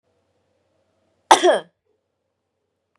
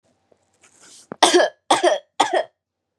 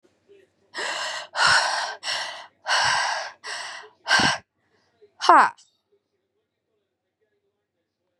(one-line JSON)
{"cough_length": "3.0 s", "cough_amplitude": 32768, "cough_signal_mean_std_ratio": 0.21, "three_cough_length": "3.0 s", "three_cough_amplitude": 32767, "three_cough_signal_mean_std_ratio": 0.39, "exhalation_length": "8.2 s", "exhalation_amplitude": 31175, "exhalation_signal_mean_std_ratio": 0.4, "survey_phase": "beta (2021-08-13 to 2022-03-07)", "age": "18-44", "gender": "Female", "wearing_mask": "No", "symptom_none": true, "smoker_status": "Never smoked", "respiratory_condition_asthma": false, "respiratory_condition_other": false, "recruitment_source": "REACT", "submission_delay": "1 day", "covid_test_result": "Negative", "covid_test_method": "RT-qPCR", "influenza_a_test_result": "Negative", "influenza_b_test_result": "Negative"}